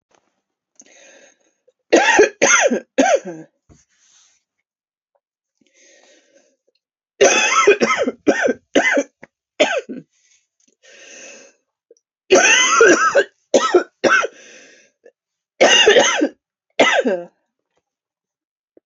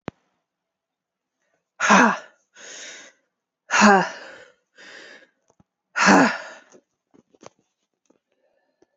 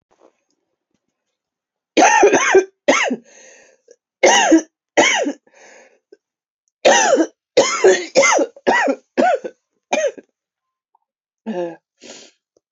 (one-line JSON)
{"three_cough_length": "18.9 s", "three_cough_amplitude": 32768, "three_cough_signal_mean_std_ratio": 0.42, "exhalation_length": "9.0 s", "exhalation_amplitude": 27489, "exhalation_signal_mean_std_ratio": 0.29, "cough_length": "12.7 s", "cough_amplitude": 31650, "cough_signal_mean_std_ratio": 0.45, "survey_phase": "beta (2021-08-13 to 2022-03-07)", "age": "45-64", "gender": "Female", "wearing_mask": "No", "symptom_cough_any": true, "symptom_new_continuous_cough": true, "symptom_runny_or_blocked_nose": true, "symptom_shortness_of_breath": true, "symptom_sore_throat": true, "symptom_fatigue": true, "symptom_change_to_sense_of_smell_or_taste": true, "symptom_loss_of_taste": true, "symptom_onset": "15 days", "smoker_status": "Ex-smoker", "respiratory_condition_asthma": false, "respiratory_condition_other": false, "recruitment_source": "Test and Trace", "submission_delay": "2 days", "covid_test_result": "Positive", "covid_test_method": "ePCR"}